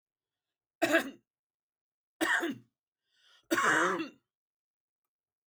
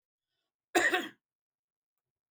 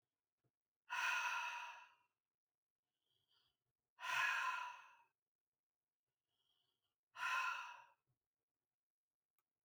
three_cough_length: 5.5 s
three_cough_amplitude: 7326
three_cough_signal_mean_std_ratio: 0.36
cough_length: 2.3 s
cough_amplitude: 7585
cough_signal_mean_std_ratio: 0.28
exhalation_length: 9.6 s
exhalation_amplitude: 1348
exhalation_signal_mean_std_ratio: 0.38
survey_phase: beta (2021-08-13 to 2022-03-07)
age: 65+
gender: Male
wearing_mask: 'No'
symptom_cough_any: true
smoker_status: Ex-smoker
respiratory_condition_asthma: false
respiratory_condition_other: false
recruitment_source: REACT
submission_delay: 7 days
covid_test_result: Negative
covid_test_method: RT-qPCR
influenza_a_test_result: Negative
influenza_b_test_result: Negative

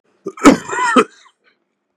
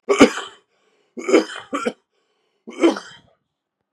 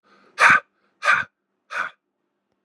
cough_length: 2.0 s
cough_amplitude: 32768
cough_signal_mean_std_ratio: 0.37
three_cough_length: 3.9 s
three_cough_amplitude: 32768
three_cough_signal_mean_std_ratio: 0.33
exhalation_length: 2.6 s
exhalation_amplitude: 27485
exhalation_signal_mean_std_ratio: 0.33
survey_phase: beta (2021-08-13 to 2022-03-07)
age: 18-44
gender: Male
wearing_mask: 'No'
symptom_cough_any: true
symptom_runny_or_blocked_nose: true
symptom_shortness_of_breath: true
symptom_sore_throat: true
symptom_fatigue: true
symptom_headache: true
symptom_onset: 2 days
smoker_status: Current smoker (e-cigarettes or vapes only)
respiratory_condition_asthma: false
respiratory_condition_other: false
recruitment_source: Test and Trace
submission_delay: 1 day
covid_test_result: Positive
covid_test_method: RT-qPCR
covid_ct_value: 27.2
covid_ct_gene: N gene
covid_ct_mean: 27.4
covid_viral_load: 1000 copies/ml
covid_viral_load_category: Minimal viral load (< 10K copies/ml)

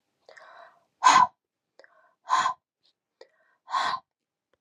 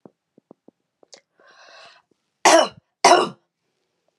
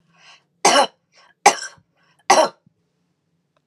exhalation_length: 4.6 s
exhalation_amplitude: 17286
exhalation_signal_mean_std_ratio: 0.29
cough_length: 4.2 s
cough_amplitude: 32765
cough_signal_mean_std_ratio: 0.26
three_cough_length: 3.7 s
three_cough_amplitude: 32768
three_cough_signal_mean_std_ratio: 0.29
survey_phase: beta (2021-08-13 to 2022-03-07)
age: 45-64
gender: Female
wearing_mask: 'No'
symptom_none: true
symptom_onset: 5 days
smoker_status: Never smoked
respiratory_condition_asthma: false
respiratory_condition_other: false
recruitment_source: REACT
submission_delay: 2 days
covid_test_result: Negative
covid_test_method: RT-qPCR
influenza_a_test_result: Negative
influenza_b_test_result: Negative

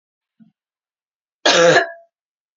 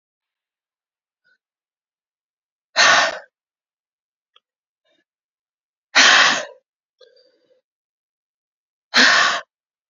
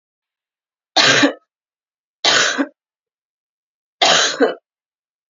cough_length: 2.6 s
cough_amplitude: 31940
cough_signal_mean_std_ratio: 0.33
exhalation_length: 9.9 s
exhalation_amplitude: 32768
exhalation_signal_mean_std_ratio: 0.28
three_cough_length: 5.3 s
three_cough_amplitude: 32767
three_cough_signal_mean_std_ratio: 0.39
survey_phase: beta (2021-08-13 to 2022-03-07)
age: 18-44
gender: Female
wearing_mask: 'No'
symptom_cough_any: true
symptom_new_continuous_cough: true
symptom_runny_or_blocked_nose: true
symptom_shortness_of_breath: true
symptom_fatigue: true
symptom_headache: true
symptom_onset: 5 days
smoker_status: Never smoked
respiratory_condition_asthma: false
respiratory_condition_other: false
recruitment_source: Test and Trace
submission_delay: 2 days
covid_test_result: Positive
covid_test_method: RT-qPCR
covid_ct_value: 22.9
covid_ct_gene: ORF1ab gene
covid_ct_mean: 23.2
covid_viral_load: 24000 copies/ml
covid_viral_load_category: Low viral load (10K-1M copies/ml)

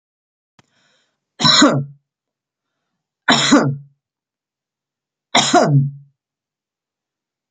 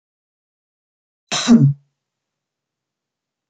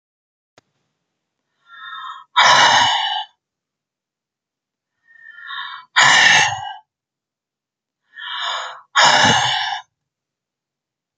three_cough_length: 7.5 s
three_cough_amplitude: 32768
three_cough_signal_mean_std_ratio: 0.36
cough_length: 3.5 s
cough_amplitude: 26532
cough_signal_mean_std_ratio: 0.25
exhalation_length: 11.2 s
exhalation_amplitude: 31691
exhalation_signal_mean_std_ratio: 0.4
survey_phase: beta (2021-08-13 to 2022-03-07)
age: 45-64
gender: Female
wearing_mask: 'No'
symptom_none: true
smoker_status: Ex-smoker
respiratory_condition_asthma: false
respiratory_condition_other: false
recruitment_source: REACT
submission_delay: 7 days
covid_test_result: Negative
covid_test_method: RT-qPCR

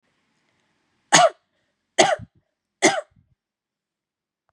three_cough_length: 4.5 s
three_cough_amplitude: 32768
three_cough_signal_mean_std_ratio: 0.25
survey_phase: beta (2021-08-13 to 2022-03-07)
age: 18-44
gender: Female
wearing_mask: 'No'
symptom_none: true
symptom_onset: 8 days
smoker_status: Never smoked
respiratory_condition_asthma: false
respiratory_condition_other: false
recruitment_source: REACT
submission_delay: 4 days
covid_test_result: Negative
covid_test_method: RT-qPCR
influenza_a_test_result: Negative
influenza_b_test_result: Negative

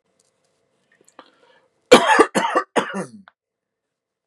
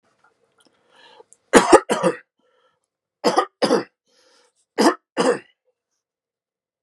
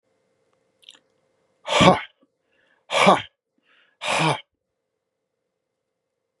cough_length: 4.3 s
cough_amplitude: 32768
cough_signal_mean_std_ratio: 0.29
three_cough_length: 6.8 s
three_cough_amplitude: 32768
three_cough_signal_mean_std_ratio: 0.29
exhalation_length: 6.4 s
exhalation_amplitude: 32568
exhalation_signal_mean_std_ratio: 0.27
survey_phase: beta (2021-08-13 to 2022-03-07)
age: 45-64
gender: Male
wearing_mask: 'No'
symptom_none: true
smoker_status: Ex-smoker
respiratory_condition_asthma: false
respiratory_condition_other: false
recruitment_source: REACT
submission_delay: 2 days
covid_test_result: Negative
covid_test_method: RT-qPCR
influenza_a_test_result: Unknown/Void
influenza_b_test_result: Unknown/Void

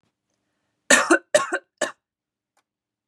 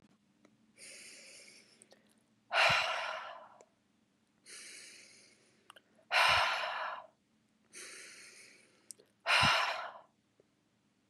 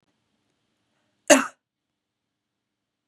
three_cough_length: 3.1 s
three_cough_amplitude: 32735
three_cough_signal_mean_std_ratio: 0.28
exhalation_length: 11.1 s
exhalation_amplitude: 5260
exhalation_signal_mean_std_ratio: 0.38
cough_length: 3.1 s
cough_amplitude: 30574
cough_signal_mean_std_ratio: 0.15
survey_phase: beta (2021-08-13 to 2022-03-07)
age: 18-44
gender: Female
wearing_mask: 'No'
symptom_cough_any: true
symptom_runny_or_blocked_nose: true
symptom_sore_throat: true
symptom_fatigue: true
symptom_fever_high_temperature: true
symptom_onset: 4 days
smoker_status: Never smoked
respiratory_condition_asthma: false
respiratory_condition_other: false
recruitment_source: Test and Trace
submission_delay: 1 day
covid_test_result: Positive
covid_test_method: RT-qPCR
covid_ct_value: 23.3
covid_ct_gene: N gene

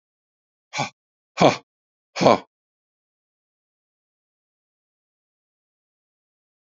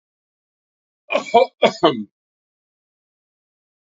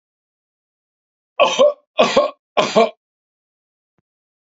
exhalation_length: 6.7 s
exhalation_amplitude: 27786
exhalation_signal_mean_std_ratio: 0.17
cough_length: 3.8 s
cough_amplitude: 27793
cough_signal_mean_std_ratio: 0.26
three_cough_length: 4.4 s
three_cough_amplitude: 28847
three_cough_signal_mean_std_ratio: 0.34
survey_phase: beta (2021-08-13 to 2022-03-07)
age: 65+
gender: Male
wearing_mask: 'No'
symptom_none: true
smoker_status: Ex-smoker
respiratory_condition_asthma: false
respiratory_condition_other: false
recruitment_source: Test and Trace
submission_delay: 1 day
covid_test_result: Negative
covid_test_method: ePCR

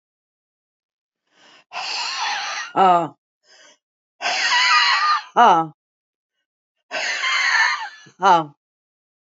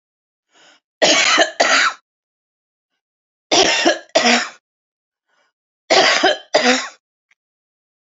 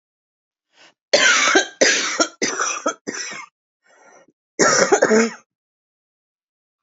exhalation_length: 9.2 s
exhalation_amplitude: 26641
exhalation_signal_mean_std_ratio: 0.48
three_cough_length: 8.2 s
three_cough_amplitude: 32406
three_cough_signal_mean_std_ratio: 0.43
cough_length: 6.8 s
cough_amplitude: 30134
cough_signal_mean_std_ratio: 0.45
survey_phase: alpha (2021-03-01 to 2021-08-12)
age: 65+
gender: Female
wearing_mask: 'No'
symptom_none: true
smoker_status: Ex-smoker
respiratory_condition_asthma: false
respiratory_condition_other: false
recruitment_source: REACT
submission_delay: 1 day
covid_test_result: Negative
covid_test_method: RT-qPCR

